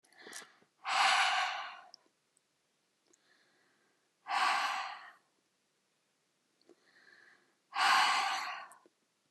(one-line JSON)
{"exhalation_length": "9.3 s", "exhalation_amplitude": 5575, "exhalation_signal_mean_std_ratio": 0.41, "survey_phase": "beta (2021-08-13 to 2022-03-07)", "age": "45-64", "gender": "Female", "wearing_mask": "No", "symptom_sore_throat": true, "symptom_headache": true, "smoker_status": "Never smoked", "respiratory_condition_asthma": false, "respiratory_condition_other": false, "recruitment_source": "REACT", "submission_delay": "3 days", "covid_test_result": "Negative", "covid_test_method": "RT-qPCR"}